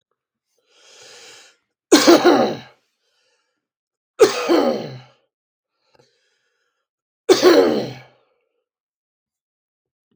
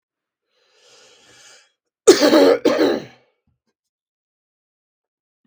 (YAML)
three_cough_length: 10.2 s
three_cough_amplitude: 32768
three_cough_signal_mean_std_ratio: 0.31
cough_length: 5.5 s
cough_amplitude: 32768
cough_signal_mean_std_ratio: 0.3
survey_phase: beta (2021-08-13 to 2022-03-07)
age: 45-64
gender: Male
wearing_mask: 'No'
symptom_cough_any: true
symptom_runny_or_blocked_nose: true
symptom_fatigue: true
symptom_change_to_sense_of_smell_or_taste: true
smoker_status: Ex-smoker
respiratory_condition_asthma: false
respiratory_condition_other: false
recruitment_source: Test and Trace
submission_delay: 2 days
covid_test_result: Positive
covid_test_method: RT-qPCR